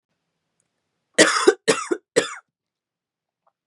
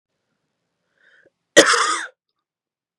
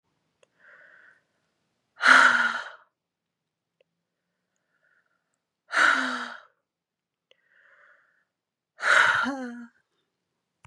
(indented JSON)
{
  "three_cough_length": "3.7 s",
  "three_cough_amplitude": 32393,
  "three_cough_signal_mean_std_ratio": 0.29,
  "cough_length": "3.0 s",
  "cough_amplitude": 32768,
  "cough_signal_mean_std_ratio": 0.27,
  "exhalation_length": "10.7 s",
  "exhalation_amplitude": 21232,
  "exhalation_signal_mean_std_ratio": 0.3,
  "survey_phase": "beta (2021-08-13 to 2022-03-07)",
  "age": "18-44",
  "gender": "Female",
  "wearing_mask": "No",
  "symptom_new_continuous_cough": true,
  "symptom_runny_or_blocked_nose": true,
  "symptom_shortness_of_breath": true,
  "symptom_sore_throat": true,
  "symptom_headache": true,
  "symptom_other": true,
  "symptom_onset": "3 days",
  "smoker_status": "Ex-smoker",
  "respiratory_condition_asthma": false,
  "respiratory_condition_other": false,
  "recruitment_source": "Test and Trace",
  "submission_delay": "2 days",
  "covid_test_result": "Positive",
  "covid_test_method": "ePCR"
}